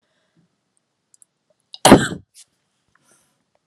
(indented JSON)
{
  "cough_length": "3.7 s",
  "cough_amplitude": 32768,
  "cough_signal_mean_std_ratio": 0.18,
  "survey_phase": "alpha (2021-03-01 to 2021-08-12)",
  "age": "45-64",
  "gender": "Female",
  "wearing_mask": "No",
  "symptom_none": true,
  "smoker_status": "Never smoked",
  "respiratory_condition_asthma": false,
  "respiratory_condition_other": false,
  "recruitment_source": "REACT",
  "submission_delay": "5 days",
  "covid_test_result": "Negative",
  "covid_test_method": "RT-qPCR"
}